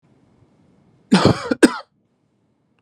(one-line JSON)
{"cough_length": "2.8 s", "cough_amplitude": 32768, "cough_signal_mean_std_ratio": 0.28, "survey_phase": "beta (2021-08-13 to 2022-03-07)", "age": "45-64", "gender": "Male", "wearing_mask": "No", "symptom_none": true, "smoker_status": "Never smoked", "respiratory_condition_asthma": false, "respiratory_condition_other": false, "recruitment_source": "REACT", "submission_delay": "1 day", "covid_test_result": "Negative", "covid_test_method": "RT-qPCR", "influenza_a_test_result": "Negative", "influenza_b_test_result": "Negative"}